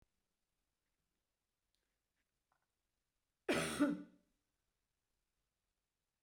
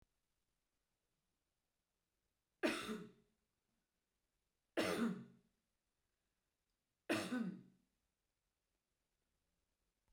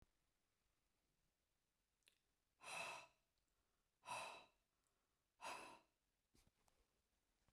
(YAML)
cough_length: 6.2 s
cough_amplitude: 2115
cough_signal_mean_std_ratio: 0.22
three_cough_length: 10.1 s
three_cough_amplitude: 1926
three_cough_signal_mean_std_ratio: 0.28
exhalation_length: 7.5 s
exhalation_amplitude: 373
exhalation_signal_mean_std_ratio: 0.33
survey_phase: beta (2021-08-13 to 2022-03-07)
age: 65+
gender: Female
wearing_mask: 'No'
symptom_none: true
smoker_status: Never smoked
respiratory_condition_asthma: false
respiratory_condition_other: false
recruitment_source: REACT
submission_delay: 2 days
covid_test_result: Negative
covid_test_method: RT-qPCR
influenza_a_test_result: Negative
influenza_b_test_result: Negative